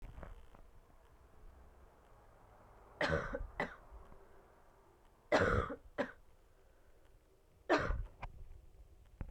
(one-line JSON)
{"three_cough_length": "9.3 s", "three_cough_amplitude": 4527, "three_cough_signal_mean_std_ratio": 0.39, "survey_phase": "beta (2021-08-13 to 2022-03-07)", "age": "18-44", "gender": "Female", "wearing_mask": "No", "symptom_cough_any": true, "symptom_runny_or_blocked_nose": true, "symptom_shortness_of_breath": true, "symptom_fatigue": true, "symptom_change_to_sense_of_smell_or_taste": true, "symptom_loss_of_taste": true, "symptom_onset": "3 days", "smoker_status": "Never smoked", "respiratory_condition_asthma": false, "respiratory_condition_other": false, "recruitment_source": "Test and Trace", "submission_delay": "1 day", "covid_test_result": "Positive", "covid_test_method": "RT-qPCR", "covid_ct_value": 11.7, "covid_ct_gene": "ORF1ab gene", "covid_ct_mean": 12.2, "covid_viral_load": "100000000 copies/ml", "covid_viral_load_category": "High viral load (>1M copies/ml)"}